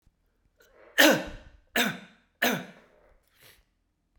{"three_cough_length": "4.2 s", "three_cough_amplitude": 21269, "three_cough_signal_mean_std_ratio": 0.3, "survey_phase": "beta (2021-08-13 to 2022-03-07)", "age": "45-64", "gender": "Male", "wearing_mask": "No", "symptom_cough_any": true, "symptom_runny_or_blocked_nose": true, "symptom_fatigue": true, "symptom_change_to_sense_of_smell_or_taste": true, "symptom_loss_of_taste": true, "symptom_onset": "3 days", "smoker_status": "Ex-smoker", "respiratory_condition_asthma": false, "respiratory_condition_other": false, "recruitment_source": "Test and Trace", "submission_delay": "2 days", "covid_test_result": "Positive", "covid_test_method": "RT-qPCR", "covid_ct_value": 19.0, "covid_ct_gene": "ORF1ab gene", "covid_ct_mean": 19.6, "covid_viral_load": "370000 copies/ml", "covid_viral_load_category": "Low viral load (10K-1M copies/ml)"}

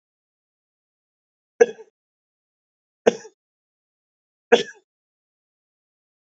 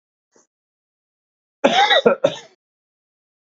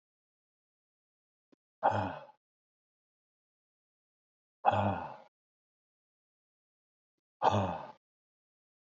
{"three_cough_length": "6.2 s", "three_cough_amplitude": 28862, "three_cough_signal_mean_std_ratio": 0.13, "cough_length": "3.6 s", "cough_amplitude": 30130, "cough_signal_mean_std_ratio": 0.31, "exhalation_length": "8.9 s", "exhalation_amplitude": 8050, "exhalation_signal_mean_std_ratio": 0.26, "survey_phase": "beta (2021-08-13 to 2022-03-07)", "age": "65+", "gender": "Male", "wearing_mask": "No", "symptom_cough_any": true, "symptom_diarrhoea": true, "symptom_headache": true, "symptom_change_to_sense_of_smell_or_taste": true, "symptom_onset": "4 days", "smoker_status": "Never smoked", "respiratory_condition_asthma": false, "respiratory_condition_other": false, "recruitment_source": "Test and Trace", "submission_delay": "1 day", "covid_test_result": "Positive", "covid_test_method": "RT-qPCR", "covid_ct_value": 16.8, "covid_ct_gene": "ORF1ab gene", "covid_ct_mean": 17.0, "covid_viral_load": "2700000 copies/ml", "covid_viral_load_category": "High viral load (>1M copies/ml)"}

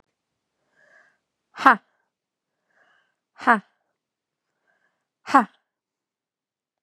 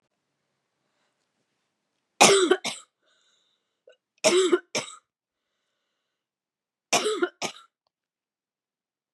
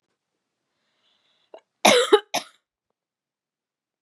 {"exhalation_length": "6.8 s", "exhalation_amplitude": 32720, "exhalation_signal_mean_std_ratio": 0.16, "three_cough_length": "9.1 s", "three_cough_amplitude": 26018, "three_cough_signal_mean_std_ratio": 0.27, "cough_length": "4.0 s", "cough_amplitude": 28977, "cough_signal_mean_std_ratio": 0.22, "survey_phase": "beta (2021-08-13 to 2022-03-07)", "age": "18-44", "gender": "Female", "wearing_mask": "No", "symptom_runny_or_blocked_nose": true, "symptom_fatigue": true, "symptom_headache": true, "symptom_onset": "3 days", "smoker_status": "Never smoked", "respiratory_condition_asthma": false, "respiratory_condition_other": false, "recruitment_source": "Test and Trace", "submission_delay": "2 days", "covid_test_result": "Positive", "covid_test_method": "RT-qPCR", "covid_ct_value": 27.9, "covid_ct_gene": "N gene", "covid_ct_mean": 28.0, "covid_viral_load": "640 copies/ml", "covid_viral_load_category": "Minimal viral load (< 10K copies/ml)"}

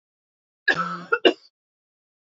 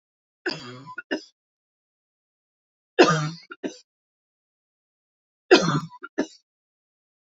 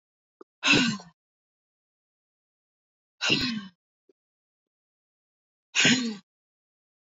{"cough_length": "2.2 s", "cough_amplitude": 26426, "cough_signal_mean_std_ratio": 0.29, "three_cough_length": "7.3 s", "three_cough_amplitude": 25302, "three_cough_signal_mean_std_ratio": 0.25, "exhalation_length": "7.1 s", "exhalation_amplitude": 13920, "exhalation_signal_mean_std_ratio": 0.3, "survey_phase": "beta (2021-08-13 to 2022-03-07)", "age": "45-64", "gender": "Female", "wearing_mask": "No", "symptom_none": true, "symptom_onset": "12 days", "smoker_status": "Never smoked", "respiratory_condition_asthma": false, "respiratory_condition_other": false, "recruitment_source": "REACT", "submission_delay": "1 day", "covid_test_result": "Negative", "covid_test_method": "RT-qPCR"}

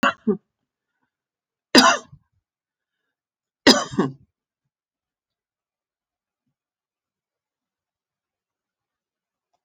{"three_cough_length": "9.6 s", "three_cough_amplitude": 31501, "three_cough_signal_mean_std_ratio": 0.19, "survey_phase": "alpha (2021-03-01 to 2021-08-12)", "age": "65+", "gender": "Female", "wearing_mask": "No", "symptom_none": true, "symptom_cough_any": true, "smoker_status": "Never smoked", "respiratory_condition_asthma": true, "respiratory_condition_other": false, "recruitment_source": "REACT", "submission_delay": "1 day", "covid_test_result": "Negative", "covid_test_method": "RT-qPCR"}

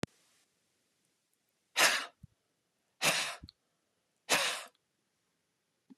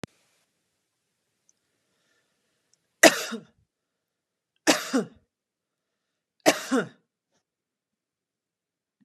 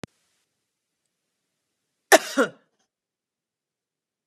{"exhalation_length": "6.0 s", "exhalation_amplitude": 8104, "exhalation_signal_mean_std_ratio": 0.3, "three_cough_length": "9.0 s", "three_cough_amplitude": 32645, "three_cough_signal_mean_std_ratio": 0.19, "cough_length": "4.3 s", "cough_amplitude": 31103, "cough_signal_mean_std_ratio": 0.15, "survey_phase": "beta (2021-08-13 to 2022-03-07)", "age": "45-64", "gender": "Female", "wearing_mask": "No", "symptom_none": true, "smoker_status": "Ex-smoker", "respiratory_condition_asthma": false, "respiratory_condition_other": false, "recruitment_source": "REACT", "submission_delay": "2 days", "covid_test_result": "Negative", "covid_test_method": "RT-qPCR", "influenza_a_test_result": "Negative", "influenza_b_test_result": "Negative"}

